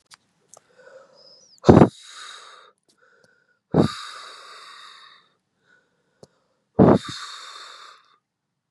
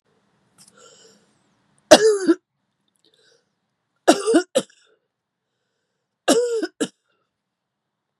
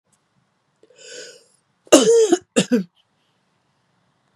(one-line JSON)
{"exhalation_length": "8.7 s", "exhalation_amplitude": 32768, "exhalation_signal_mean_std_ratio": 0.23, "three_cough_length": "8.2 s", "three_cough_amplitude": 32768, "three_cough_signal_mean_std_ratio": 0.27, "cough_length": "4.4 s", "cough_amplitude": 32768, "cough_signal_mean_std_ratio": 0.31, "survey_phase": "beta (2021-08-13 to 2022-03-07)", "age": "65+", "gender": "Female", "wearing_mask": "No", "symptom_none": true, "smoker_status": "Never smoked", "respiratory_condition_asthma": true, "respiratory_condition_other": false, "recruitment_source": "REACT", "submission_delay": "3 days", "covid_test_result": "Negative", "covid_test_method": "RT-qPCR", "influenza_a_test_result": "Negative", "influenza_b_test_result": "Negative"}